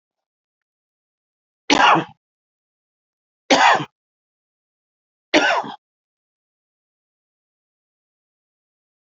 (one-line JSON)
{"three_cough_length": "9.0 s", "three_cough_amplitude": 30963, "three_cough_signal_mean_std_ratio": 0.25, "survey_phase": "alpha (2021-03-01 to 2021-08-12)", "age": "65+", "gender": "Male", "wearing_mask": "No", "symptom_none": true, "smoker_status": "Never smoked", "respiratory_condition_asthma": false, "respiratory_condition_other": false, "recruitment_source": "REACT", "submission_delay": "1 day", "covid_test_result": "Negative", "covid_test_method": "RT-qPCR"}